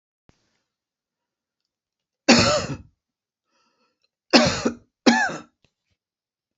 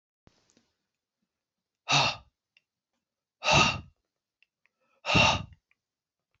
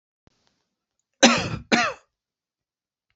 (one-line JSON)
{"three_cough_length": "6.6 s", "three_cough_amplitude": 28747, "three_cough_signal_mean_std_ratio": 0.29, "exhalation_length": "6.4 s", "exhalation_amplitude": 12212, "exhalation_signal_mean_std_ratio": 0.3, "cough_length": "3.2 s", "cough_amplitude": 31618, "cough_signal_mean_std_ratio": 0.28, "survey_phase": "beta (2021-08-13 to 2022-03-07)", "age": "65+", "gender": "Male", "wearing_mask": "No", "symptom_cough_any": true, "symptom_runny_or_blocked_nose": true, "symptom_shortness_of_breath": true, "symptom_sore_throat": true, "symptom_fatigue": true, "symptom_fever_high_temperature": true, "symptom_headache": true, "symptom_change_to_sense_of_smell_or_taste": true, "smoker_status": "Never smoked", "respiratory_condition_asthma": true, "respiratory_condition_other": false, "recruitment_source": "Test and Trace", "submission_delay": "2 days", "covid_test_result": "Positive", "covid_test_method": "LFT"}